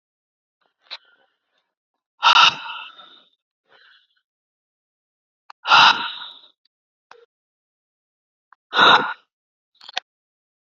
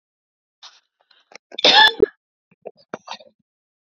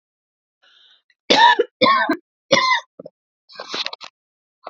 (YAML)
exhalation_length: 10.7 s
exhalation_amplitude: 29173
exhalation_signal_mean_std_ratio: 0.25
cough_length: 3.9 s
cough_amplitude: 30715
cough_signal_mean_std_ratio: 0.24
three_cough_length: 4.7 s
three_cough_amplitude: 30799
three_cough_signal_mean_std_ratio: 0.38
survey_phase: beta (2021-08-13 to 2022-03-07)
age: 18-44
gender: Female
wearing_mask: 'No'
symptom_cough_any: true
symptom_runny_or_blocked_nose: true
symptom_sore_throat: true
symptom_fatigue: true
symptom_headache: true
smoker_status: Ex-smoker
respiratory_condition_asthma: false
respiratory_condition_other: false
recruitment_source: Test and Trace
submission_delay: 0 days
covid_test_result: Positive
covid_test_method: LFT